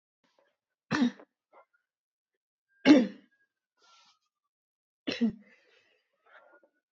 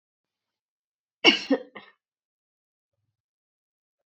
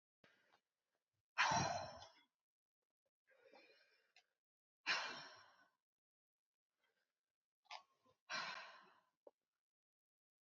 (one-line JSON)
{"three_cough_length": "6.9 s", "three_cough_amplitude": 16001, "three_cough_signal_mean_std_ratio": 0.22, "cough_length": "4.1 s", "cough_amplitude": 24353, "cough_signal_mean_std_ratio": 0.17, "exhalation_length": "10.4 s", "exhalation_amplitude": 1842, "exhalation_signal_mean_std_ratio": 0.27, "survey_phase": "beta (2021-08-13 to 2022-03-07)", "age": "18-44", "gender": "Female", "wearing_mask": "No", "symptom_cough_any": true, "symptom_runny_or_blocked_nose": true, "symptom_fatigue": true, "symptom_onset": "3 days", "smoker_status": "Never smoked", "respiratory_condition_asthma": false, "respiratory_condition_other": false, "recruitment_source": "Test and Trace", "submission_delay": "2 days", "covid_test_result": "Positive", "covid_test_method": "RT-qPCR", "covid_ct_value": 19.6, "covid_ct_gene": "ORF1ab gene", "covid_ct_mean": 20.1, "covid_viral_load": "250000 copies/ml", "covid_viral_load_category": "Low viral load (10K-1M copies/ml)"}